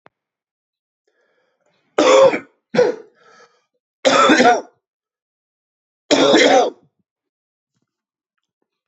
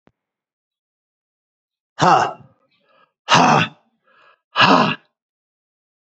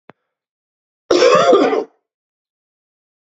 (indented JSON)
{
  "three_cough_length": "8.9 s",
  "three_cough_amplitude": 28555,
  "three_cough_signal_mean_std_ratio": 0.37,
  "exhalation_length": "6.1 s",
  "exhalation_amplitude": 30862,
  "exhalation_signal_mean_std_ratio": 0.33,
  "cough_length": "3.3 s",
  "cough_amplitude": 32768,
  "cough_signal_mean_std_ratio": 0.39,
  "survey_phase": "alpha (2021-03-01 to 2021-08-12)",
  "age": "45-64",
  "gender": "Male",
  "wearing_mask": "No",
  "symptom_cough_any": true,
  "symptom_fatigue": true,
  "symptom_headache": true,
  "symptom_change_to_sense_of_smell_or_taste": true,
  "symptom_loss_of_taste": true,
  "symptom_onset": "6 days",
  "smoker_status": "Never smoked",
  "respiratory_condition_asthma": false,
  "respiratory_condition_other": false,
  "recruitment_source": "Test and Trace",
  "submission_delay": "2 days",
  "covid_test_result": "Positive",
  "covid_test_method": "RT-qPCR"
}